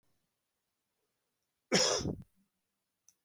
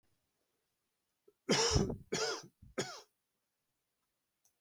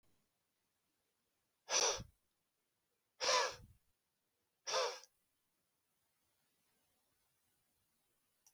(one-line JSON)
{"cough_length": "3.2 s", "cough_amplitude": 8793, "cough_signal_mean_std_ratio": 0.28, "three_cough_length": "4.6 s", "three_cough_amplitude": 4658, "three_cough_signal_mean_std_ratio": 0.34, "exhalation_length": "8.5 s", "exhalation_amplitude": 2506, "exhalation_signal_mean_std_ratio": 0.26, "survey_phase": "beta (2021-08-13 to 2022-03-07)", "age": "45-64", "gender": "Male", "wearing_mask": "No", "symptom_none": true, "smoker_status": "Never smoked", "respiratory_condition_asthma": false, "respiratory_condition_other": false, "recruitment_source": "REACT", "submission_delay": "1 day", "covid_test_result": "Negative", "covid_test_method": "RT-qPCR", "influenza_a_test_result": "Negative", "influenza_b_test_result": "Negative"}